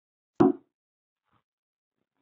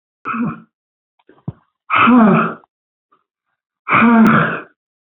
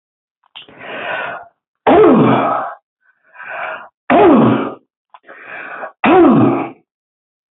{
  "cough_length": "2.2 s",
  "cough_amplitude": 13605,
  "cough_signal_mean_std_ratio": 0.18,
  "exhalation_length": "5.0 s",
  "exhalation_amplitude": 29269,
  "exhalation_signal_mean_std_ratio": 0.48,
  "three_cough_length": "7.5 s",
  "three_cough_amplitude": 32767,
  "three_cough_signal_mean_std_ratio": 0.51,
  "survey_phase": "beta (2021-08-13 to 2022-03-07)",
  "age": "65+",
  "gender": "Female",
  "wearing_mask": "No",
  "symptom_none": true,
  "smoker_status": "Ex-smoker",
  "respiratory_condition_asthma": false,
  "respiratory_condition_other": false,
  "recruitment_source": "REACT",
  "submission_delay": "1 day",
  "covid_test_result": "Negative",
  "covid_test_method": "RT-qPCR"
}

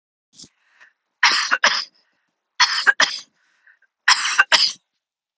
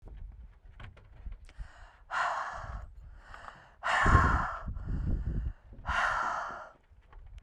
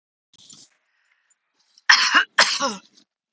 {
  "three_cough_length": "5.4 s",
  "three_cough_amplitude": 32614,
  "three_cough_signal_mean_std_ratio": 0.38,
  "exhalation_length": "7.4 s",
  "exhalation_amplitude": 11266,
  "exhalation_signal_mean_std_ratio": 0.57,
  "cough_length": "3.3 s",
  "cough_amplitude": 32768,
  "cough_signal_mean_std_ratio": 0.32,
  "survey_phase": "beta (2021-08-13 to 2022-03-07)",
  "age": "18-44",
  "gender": "Female",
  "wearing_mask": "No",
  "symptom_none": true,
  "smoker_status": "Never smoked",
  "respiratory_condition_asthma": false,
  "respiratory_condition_other": false,
  "recruitment_source": "REACT",
  "submission_delay": "2 days",
  "covid_test_result": "Negative",
  "covid_test_method": "RT-qPCR"
}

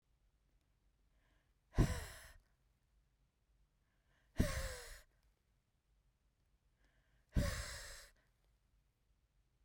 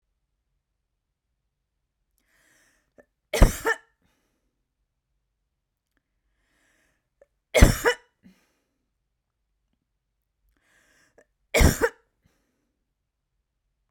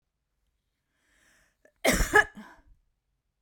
{
  "exhalation_length": "9.6 s",
  "exhalation_amplitude": 3692,
  "exhalation_signal_mean_std_ratio": 0.26,
  "three_cough_length": "13.9 s",
  "three_cough_amplitude": 32767,
  "three_cough_signal_mean_std_ratio": 0.17,
  "cough_length": "3.4 s",
  "cough_amplitude": 15687,
  "cough_signal_mean_std_ratio": 0.25,
  "survey_phase": "beta (2021-08-13 to 2022-03-07)",
  "age": "45-64",
  "gender": "Female",
  "wearing_mask": "No",
  "symptom_none": true,
  "smoker_status": "Never smoked",
  "respiratory_condition_asthma": true,
  "respiratory_condition_other": false,
  "recruitment_source": "REACT",
  "submission_delay": "4 days",
  "covid_test_result": "Negative",
  "covid_test_method": "RT-qPCR",
  "influenza_a_test_result": "Negative",
  "influenza_b_test_result": "Negative"
}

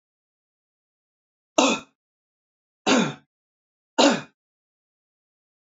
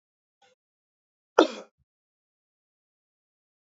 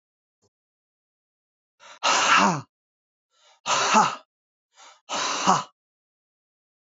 {
  "three_cough_length": "5.6 s",
  "three_cough_amplitude": 27360,
  "three_cough_signal_mean_std_ratio": 0.26,
  "cough_length": "3.7 s",
  "cough_amplitude": 26624,
  "cough_signal_mean_std_ratio": 0.12,
  "exhalation_length": "6.8 s",
  "exhalation_amplitude": 23324,
  "exhalation_signal_mean_std_ratio": 0.37,
  "survey_phase": "beta (2021-08-13 to 2022-03-07)",
  "age": "45-64",
  "gender": "Male",
  "wearing_mask": "No",
  "symptom_none": true,
  "smoker_status": "Never smoked",
  "respiratory_condition_asthma": false,
  "respiratory_condition_other": false,
  "recruitment_source": "REACT",
  "submission_delay": "1 day",
  "covid_test_result": "Negative",
  "covid_test_method": "RT-qPCR",
  "influenza_a_test_result": "Negative",
  "influenza_b_test_result": "Negative"
}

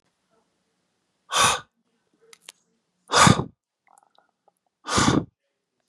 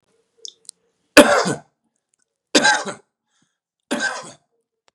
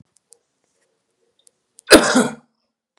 {
  "exhalation_length": "5.9 s",
  "exhalation_amplitude": 29808,
  "exhalation_signal_mean_std_ratio": 0.29,
  "three_cough_length": "4.9 s",
  "three_cough_amplitude": 32768,
  "three_cough_signal_mean_std_ratio": 0.29,
  "cough_length": "3.0 s",
  "cough_amplitude": 32768,
  "cough_signal_mean_std_ratio": 0.25,
  "survey_phase": "beta (2021-08-13 to 2022-03-07)",
  "age": "18-44",
  "gender": "Male",
  "wearing_mask": "No",
  "symptom_fatigue": true,
  "symptom_other": true,
  "symptom_onset": "10 days",
  "smoker_status": "Current smoker (11 or more cigarettes per day)",
  "respiratory_condition_asthma": false,
  "respiratory_condition_other": false,
  "recruitment_source": "REACT",
  "submission_delay": "1 day",
  "covid_test_result": "Negative",
  "covid_test_method": "RT-qPCR"
}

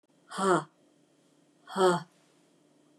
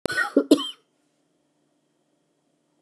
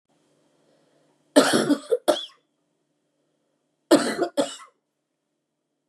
{
  "exhalation_length": "3.0 s",
  "exhalation_amplitude": 8433,
  "exhalation_signal_mean_std_ratio": 0.35,
  "cough_length": "2.8 s",
  "cough_amplitude": 22980,
  "cough_signal_mean_std_ratio": 0.26,
  "three_cough_length": "5.9 s",
  "three_cough_amplitude": 26445,
  "three_cough_signal_mean_std_ratio": 0.31,
  "survey_phase": "beta (2021-08-13 to 2022-03-07)",
  "age": "45-64",
  "gender": "Female",
  "wearing_mask": "No",
  "symptom_cough_any": true,
  "symptom_runny_or_blocked_nose": true,
  "symptom_shortness_of_breath": true,
  "symptom_fatigue": true,
  "symptom_headache": true,
  "symptom_change_to_sense_of_smell_or_taste": true,
  "symptom_onset": "9 days",
  "smoker_status": "Never smoked",
  "respiratory_condition_asthma": false,
  "respiratory_condition_other": false,
  "recruitment_source": "REACT",
  "submission_delay": "2 days",
  "covid_test_result": "Positive",
  "covid_test_method": "RT-qPCR",
  "covid_ct_value": 24.8,
  "covid_ct_gene": "E gene",
  "influenza_a_test_result": "Negative",
  "influenza_b_test_result": "Negative"
}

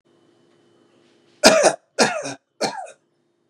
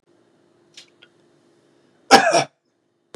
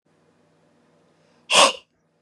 {
  "three_cough_length": "3.5 s",
  "three_cough_amplitude": 32768,
  "three_cough_signal_mean_std_ratio": 0.33,
  "cough_length": "3.2 s",
  "cough_amplitude": 32768,
  "cough_signal_mean_std_ratio": 0.24,
  "exhalation_length": "2.2 s",
  "exhalation_amplitude": 27705,
  "exhalation_signal_mean_std_ratio": 0.25,
  "survey_phase": "beta (2021-08-13 to 2022-03-07)",
  "age": "18-44",
  "gender": "Male",
  "wearing_mask": "No",
  "symptom_none": true,
  "smoker_status": "Never smoked",
  "respiratory_condition_asthma": false,
  "respiratory_condition_other": false,
  "recruitment_source": "REACT",
  "submission_delay": "1 day",
  "covid_test_result": "Negative",
  "covid_test_method": "RT-qPCR"
}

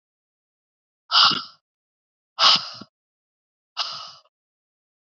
{
  "exhalation_length": "5.0 s",
  "exhalation_amplitude": 26956,
  "exhalation_signal_mean_std_ratio": 0.27,
  "survey_phase": "beta (2021-08-13 to 2022-03-07)",
  "age": "18-44",
  "gender": "Female",
  "wearing_mask": "No",
  "symptom_cough_any": true,
  "symptom_new_continuous_cough": true,
  "symptom_runny_or_blocked_nose": true,
  "symptom_shortness_of_breath": true,
  "symptom_sore_throat": true,
  "symptom_fatigue": true,
  "symptom_fever_high_temperature": true,
  "symptom_headache": true,
  "symptom_onset": "3 days",
  "smoker_status": "Ex-smoker",
  "respiratory_condition_asthma": false,
  "respiratory_condition_other": false,
  "recruitment_source": "Test and Trace",
  "submission_delay": "1 day",
  "covid_test_result": "Positive",
  "covid_test_method": "RT-qPCR",
  "covid_ct_value": 21.4,
  "covid_ct_gene": "ORF1ab gene",
  "covid_ct_mean": 22.0,
  "covid_viral_load": "59000 copies/ml",
  "covid_viral_load_category": "Low viral load (10K-1M copies/ml)"
}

